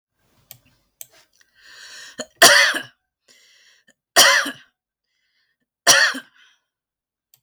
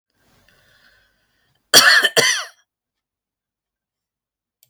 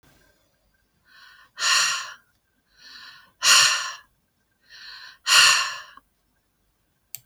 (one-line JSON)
{"three_cough_length": "7.4 s", "three_cough_amplitude": 32768, "three_cough_signal_mean_std_ratio": 0.29, "cough_length": "4.7 s", "cough_amplitude": 32768, "cough_signal_mean_std_ratio": 0.27, "exhalation_length": "7.3 s", "exhalation_amplitude": 26180, "exhalation_signal_mean_std_ratio": 0.35, "survey_phase": "beta (2021-08-13 to 2022-03-07)", "age": "45-64", "gender": "Female", "wearing_mask": "No", "symptom_none": true, "smoker_status": "Never smoked", "respiratory_condition_asthma": false, "respiratory_condition_other": false, "recruitment_source": "REACT", "submission_delay": "1 day", "covid_test_result": "Negative", "covid_test_method": "RT-qPCR", "influenza_a_test_result": "Negative", "influenza_b_test_result": "Negative"}